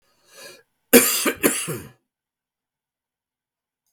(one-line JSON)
{"cough_length": "3.9 s", "cough_amplitude": 32768, "cough_signal_mean_std_ratio": 0.28, "survey_phase": "beta (2021-08-13 to 2022-03-07)", "age": "45-64", "gender": "Male", "wearing_mask": "No", "symptom_cough_any": true, "symptom_runny_or_blocked_nose": true, "symptom_sore_throat": true, "symptom_fatigue": true, "symptom_headache": true, "symptom_change_to_sense_of_smell_or_taste": true, "symptom_loss_of_taste": true, "symptom_onset": "5 days", "smoker_status": "Ex-smoker", "respiratory_condition_asthma": false, "respiratory_condition_other": false, "recruitment_source": "REACT", "submission_delay": "0 days", "covid_test_result": "Negative", "covid_test_method": "RT-qPCR", "influenza_a_test_result": "Negative", "influenza_b_test_result": "Negative"}